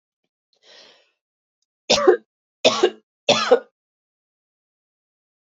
{"three_cough_length": "5.5 s", "three_cough_amplitude": 26906, "three_cough_signal_mean_std_ratio": 0.28, "survey_phase": "beta (2021-08-13 to 2022-03-07)", "age": "18-44", "gender": "Female", "wearing_mask": "No", "symptom_none": true, "smoker_status": "Never smoked", "respiratory_condition_asthma": false, "respiratory_condition_other": false, "recruitment_source": "REACT", "submission_delay": "2 days", "covid_test_result": "Negative", "covid_test_method": "RT-qPCR"}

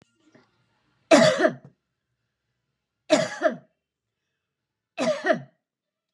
{"three_cough_length": "6.1 s", "three_cough_amplitude": 26055, "three_cough_signal_mean_std_ratio": 0.31, "survey_phase": "beta (2021-08-13 to 2022-03-07)", "age": "45-64", "gender": "Female", "wearing_mask": "No", "symptom_none": true, "symptom_onset": "13 days", "smoker_status": "Ex-smoker", "respiratory_condition_asthma": false, "respiratory_condition_other": false, "recruitment_source": "REACT", "submission_delay": "4 days", "covid_test_result": "Negative", "covid_test_method": "RT-qPCR", "influenza_a_test_result": "Negative", "influenza_b_test_result": "Negative"}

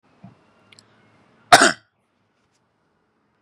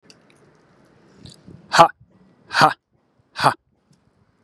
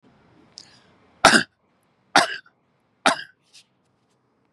{"cough_length": "3.4 s", "cough_amplitude": 32768, "cough_signal_mean_std_ratio": 0.18, "exhalation_length": "4.4 s", "exhalation_amplitude": 32768, "exhalation_signal_mean_std_ratio": 0.24, "three_cough_length": "4.5 s", "three_cough_amplitude": 32767, "three_cough_signal_mean_std_ratio": 0.23, "survey_phase": "beta (2021-08-13 to 2022-03-07)", "age": "18-44", "gender": "Male", "wearing_mask": "No", "symptom_none": true, "smoker_status": "Ex-smoker", "respiratory_condition_asthma": false, "respiratory_condition_other": false, "recruitment_source": "REACT", "submission_delay": "1 day", "covid_test_result": "Negative", "covid_test_method": "RT-qPCR"}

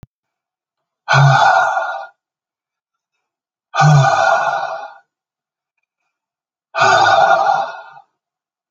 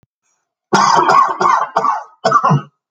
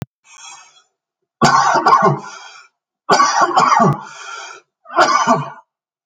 {"exhalation_length": "8.7 s", "exhalation_amplitude": 32767, "exhalation_signal_mean_std_ratio": 0.49, "cough_length": "2.9 s", "cough_amplitude": 32768, "cough_signal_mean_std_ratio": 0.65, "three_cough_length": "6.1 s", "three_cough_amplitude": 29615, "three_cough_signal_mean_std_ratio": 0.54, "survey_phase": "alpha (2021-03-01 to 2021-08-12)", "age": "45-64", "gender": "Male", "wearing_mask": "No", "symptom_none": true, "smoker_status": "Never smoked", "respiratory_condition_asthma": false, "respiratory_condition_other": false, "recruitment_source": "REACT", "submission_delay": "4 days", "covid_test_result": "Negative", "covid_test_method": "RT-qPCR"}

